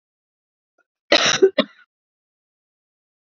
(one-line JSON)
{"cough_length": "3.2 s", "cough_amplitude": 28650, "cough_signal_mean_std_ratio": 0.26, "survey_phase": "beta (2021-08-13 to 2022-03-07)", "age": "18-44", "gender": "Female", "wearing_mask": "No", "symptom_cough_any": true, "symptom_sore_throat": true, "symptom_fatigue": true, "symptom_headache": true, "symptom_onset": "3 days", "smoker_status": "Never smoked", "respiratory_condition_asthma": false, "respiratory_condition_other": false, "recruitment_source": "Test and Trace", "submission_delay": "2 days", "covid_test_result": "Positive", "covid_test_method": "RT-qPCR", "covid_ct_value": 30.2, "covid_ct_gene": "ORF1ab gene", "covid_ct_mean": 30.2, "covid_viral_load": "120 copies/ml", "covid_viral_load_category": "Minimal viral load (< 10K copies/ml)"}